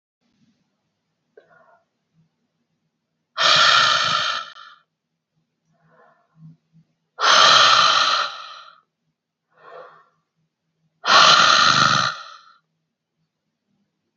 {
  "exhalation_length": "14.2 s",
  "exhalation_amplitude": 29818,
  "exhalation_signal_mean_std_ratio": 0.39,
  "survey_phase": "beta (2021-08-13 to 2022-03-07)",
  "age": "45-64",
  "gender": "Female",
  "wearing_mask": "No",
  "symptom_new_continuous_cough": true,
  "symptom_runny_or_blocked_nose": true,
  "symptom_sore_throat": true,
  "symptom_fatigue": true,
  "symptom_headache": true,
  "symptom_change_to_sense_of_smell_or_taste": true,
  "symptom_onset": "3 days",
  "smoker_status": "Never smoked",
  "respiratory_condition_asthma": false,
  "respiratory_condition_other": false,
  "recruitment_source": "Test and Trace",
  "submission_delay": "2 days",
  "covid_test_result": "Positive",
  "covid_test_method": "RT-qPCR",
  "covid_ct_value": 27.8,
  "covid_ct_gene": "ORF1ab gene",
  "covid_ct_mean": 28.4,
  "covid_viral_load": "470 copies/ml",
  "covid_viral_load_category": "Minimal viral load (< 10K copies/ml)"
}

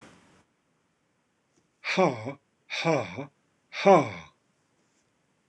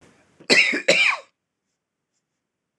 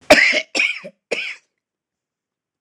{
  "exhalation_length": "5.5 s",
  "exhalation_amplitude": 15294,
  "exhalation_signal_mean_std_ratio": 0.3,
  "cough_length": "2.8 s",
  "cough_amplitude": 26028,
  "cough_signal_mean_std_ratio": 0.37,
  "three_cough_length": "2.6 s",
  "three_cough_amplitude": 26028,
  "three_cough_signal_mean_std_ratio": 0.37,
  "survey_phase": "beta (2021-08-13 to 2022-03-07)",
  "age": "45-64",
  "gender": "Male",
  "wearing_mask": "No",
  "symptom_none": true,
  "symptom_onset": "13 days",
  "smoker_status": "Never smoked",
  "respiratory_condition_asthma": false,
  "respiratory_condition_other": false,
  "recruitment_source": "REACT",
  "submission_delay": "0 days",
  "covid_test_result": "Negative",
  "covid_test_method": "RT-qPCR",
  "influenza_a_test_result": "Negative",
  "influenza_b_test_result": "Negative"
}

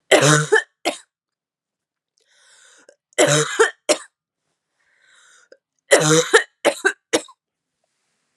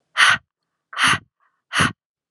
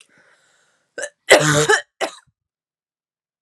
{
  "three_cough_length": "8.4 s",
  "three_cough_amplitude": 32768,
  "three_cough_signal_mean_std_ratio": 0.35,
  "exhalation_length": "2.3 s",
  "exhalation_amplitude": 27599,
  "exhalation_signal_mean_std_ratio": 0.4,
  "cough_length": "3.4 s",
  "cough_amplitude": 32768,
  "cough_signal_mean_std_ratio": 0.31,
  "survey_phase": "alpha (2021-03-01 to 2021-08-12)",
  "age": "18-44",
  "gender": "Female",
  "wearing_mask": "No",
  "symptom_cough_any": true,
  "symptom_new_continuous_cough": true,
  "symptom_shortness_of_breath": true,
  "symptom_headache": true,
  "symptom_onset": "3 days",
  "smoker_status": "Never smoked",
  "respiratory_condition_asthma": true,
  "respiratory_condition_other": false,
  "recruitment_source": "Test and Trace",
  "submission_delay": "1 day",
  "covid_test_result": "Positive",
  "covid_test_method": "ePCR"
}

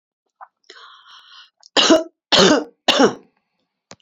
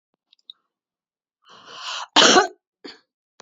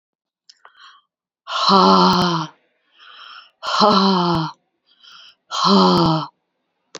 {
  "three_cough_length": "4.0 s",
  "three_cough_amplitude": 31672,
  "three_cough_signal_mean_std_ratio": 0.37,
  "cough_length": "3.4 s",
  "cough_amplitude": 32767,
  "cough_signal_mean_std_ratio": 0.27,
  "exhalation_length": "7.0 s",
  "exhalation_amplitude": 32586,
  "exhalation_signal_mean_std_ratio": 0.51,
  "survey_phase": "beta (2021-08-13 to 2022-03-07)",
  "age": "45-64",
  "gender": "Female",
  "wearing_mask": "No",
  "symptom_cough_any": true,
  "symptom_runny_or_blocked_nose": true,
  "symptom_sore_throat": true,
  "symptom_fatigue": true,
  "symptom_headache": true,
  "symptom_change_to_sense_of_smell_or_taste": true,
  "symptom_loss_of_taste": true,
  "smoker_status": "Current smoker (1 to 10 cigarettes per day)",
  "respiratory_condition_asthma": false,
  "respiratory_condition_other": false,
  "recruitment_source": "Test and Trace",
  "submission_delay": "3 days",
  "covid_test_result": "Positive",
  "covid_test_method": "LFT"
}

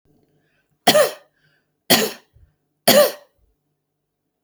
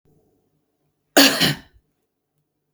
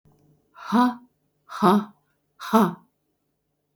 {
  "three_cough_length": "4.4 s",
  "three_cough_amplitude": 32768,
  "three_cough_signal_mean_std_ratio": 0.3,
  "cough_length": "2.7 s",
  "cough_amplitude": 32767,
  "cough_signal_mean_std_ratio": 0.27,
  "exhalation_length": "3.8 s",
  "exhalation_amplitude": 19391,
  "exhalation_signal_mean_std_ratio": 0.35,
  "survey_phase": "beta (2021-08-13 to 2022-03-07)",
  "age": "45-64",
  "gender": "Female",
  "wearing_mask": "No",
  "symptom_none": true,
  "smoker_status": "Never smoked",
  "respiratory_condition_asthma": false,
  "respiratory_condition_other": false,
  "recruitment_source": "REACT",
  "submission_delay": "1 day",
  "covid_test_result": "Negative",
  "covid_test_method": "RT-qPCR",
  "influenza_a_test_result": "Negative",
  "influenza_b_test_result": "Negative"
}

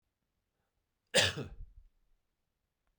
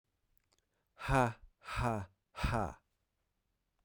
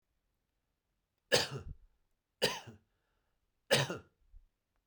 {
  "cough_length": "3.0 s",
  "cough_amplitude": 8531,
  "cough_signal_mean_std_ratio": 0.24,
  "exhalation_length": "3.8 s",
  "exhalation_amplitude": 5293,
  "exhalation_signal_mean_std_ratio": 0.39,
  "three_cough_length": "4.9 s",
  "three_cough_amplitude": 7419,
  "three_cough_signal_mean_std_ratio": 0.27,
  "survey_phase": "beta (2021-08-13 to 2022-03-07)",
  "age": "18-44",
  "gender": "Male",
  "wearing_mask": "No",
  "symptom_runny_or_blocked_nose": true,
  "smoker_status": "Never smoked",
  "respiratory_condition_asthma": false,
  "respiratory_condition_other": false,
  "recruitment_source": "Test and Trace",
  "submission_delay": "2 days",
  "covid_test_result": "Positive",
  "covid_test_method": "LAMP"
}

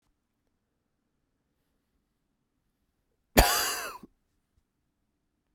{
  "cough_length": "5.5 s",
  "cough_amplitude": 22003,
  "cough_signal_mean_std_ratio": 0.2,
  "survey_phase": "beta (2021-08-13 to 2022-03-07)",
  "age": "45-64",
  "gender": "Male",
  "wearing_mask": "No",
  "symptom_cough_any": true,
  "symptom_new_continuous_cough": true,
  "symptom_runny_or_blocked_nose": true,
  "symptom_shortness_of_breath": true,
  "symptom_fatigue": true,
  "symptom_headache": true,
  "symptom_change_to_sense_of_smell_or_taste": true,
  "smoker_status": "Ex-smoker",
  "respiratory_condition_asthma": false,
  "respiratory_condition_other": false,
  "recruitment_source": "Test and Trace",
  "submission_delay": "1 day",
  "covid_test_result": "Positive",
  "covid_test_method": "RT-qPCR"
}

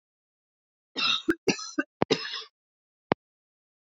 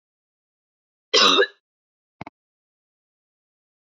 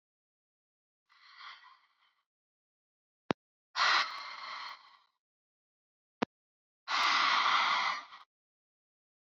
{
  "three_cough_length": "3.8 s",
  "three_cough_amplitude": 25332,
  "three_cough_signal_mean_std_ratio": 0.31,
  "cough_length": "3.8 s",
  "cough_amplitude": 26405,
  "cough_signal_mean_std_ratio": 0.24,
  "exhalation_length": "9.4 s",
  "exhalation_amplitude": 11562,
  "exhalation_signal_mean_std_ratio": 0.36,
  "survey_phase": "beta (2021-08-13 to 2022-03-07)",
  "age": "45-64",
  "gender": "Female",
  "wearing_mask": "No",
  "symptom_cough_any": true,
  "symptom_runny_or_blocked_nose": true,
  "symptom_fatigue": true,
  "symptom_fever_high_temperature": true,
  "symptom_headache": true,
  "symptom_change_to_sense_of_smell_or_taste": true,
  "symptom_loss_of_taste": true,
  "symptom_onset": "4 days",
  "smoker_status": "Never smoked",
  "respiratory_condition_asthma": false,
  "respiratory_condition_other": false,
  "recruitment_source": "Test and Trace",
  "submission_delay": "1 day",
  "covid_test_result": "Positive",
  "covid_test_method": "RT-qPCR",
  "covid_ct_value": 30.8,
  "covid_ct_gene": "N gene"
}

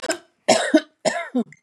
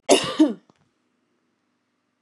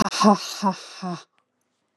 {
  "three_cough_length": "1.6 s",
  "three_cough_amplitude": 24952,
  "three_cough_signal_mean_std_ratio": 0.49,
  "cough_length": "2.2 s",
  "cough_amplitude": 26768,
  "cough_signal_mean_std_ratio": 0.29,
  "exhalation_length": "2.0 s",
  "exhalation_amplitude": 21996,
  "exhalation_signal_mean_std_ratio": 0.44,
  "survey_phase": "beta (2021-08-13 to 2022-03-07)",
  "age": "45-64",
  "gender": "Female",
  "wearing_mask": "No",
  "symptom_none": true,
  "smoker_status": "Ex-smoker",
  "respiratory_condition_asthma": false,
  "respiratory_condition_other": false,
  "recruitment_source": "REACT",
  "submission_delay": "2 days",
  "covid_test_result": "Negative",
  "covid_test_method": "RT-qPCR",
  "influenza_a_test_result": "Negative",
  "influenza_b_test_result": "Negative"
}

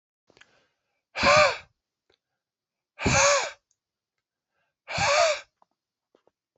{
  "exhalation_length": "6.6 s",
  "exhalation_amplitude": 16482,
  "exhalation_signal_mean_std_ratio": 0.35,
  "survey_phase": "alpha (2021-03-01 to 2021-08-12)",
  "age": "18-44",
  "gender": "Male",
  "wearing_mask": "No",
  "symptom_cough_any": true,
  "symptom_fatigue": true,
  "symptom_fever_high_temperature": true,
  "symptom_headache": true,
  "smoker_status": "Never smoked",
  "respiratory_condition_asthma": false,
  "respiratory_condition_other": false,
  "recruitment_source": "Test and Trace",
  "submission_delay": "1 day",
  "covid_test_result": "Positive",
  "covid_test_method": "RT-qPCR",
  "covid_ct_value": 19.2,
  "covid_ct_gene": "ORF1ab gene"
}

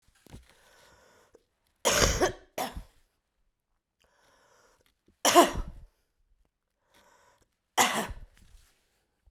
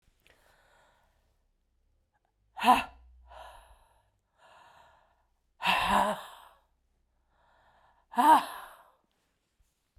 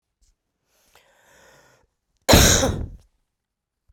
{
  "three_cough_length": "9.3 s",
  "three_cough_amplitude": 20378,
  "three_cough_signal_mean_std_ratio": 0.27,
  "exhalation_length": "10.0 s",
  "exhalation_amplitude": 12338,
  "exhalation_signal_mean_std_ratio": 0.26,
  "cough_length": "3.9 s",
  "cough_amplitude": 32768,
  "cough_signal_mean_std_ratio": 0.28,
  "survey_phase": "beta (2021-08-13 to 2022-03-07)",
  "age": "45-64",
  "gender": "Female",
  "wearing_mask": "No",
  "symptom_cough_any": true,
  "symptom_runny_or_blocked_nose": true,
  "symptom_sore_throat": true,
  "symptom_other": true,
  "symptom_onset": "2 days",
  "smoker_status": "Ex-smoker",
  "respiratory_condition_asthma": false,
  "respiratory_condition_other": false,
  "recruitment_source": "Test and Trace",
  "submission_delay": "2 days",
  "covid_test_result": "Positive",
  "covid_test_method": "RT-qPCR",
  "covid_ct_value": 20.3,
  "covid_ct_gene": "ORF1ab gene",
  "covid_ct_mean": 20.5,
  "covid_viral_load": "190000 copies/ml",
  "covid_viral_load_category": "Low viral load (10K-1M copies/ml)"
}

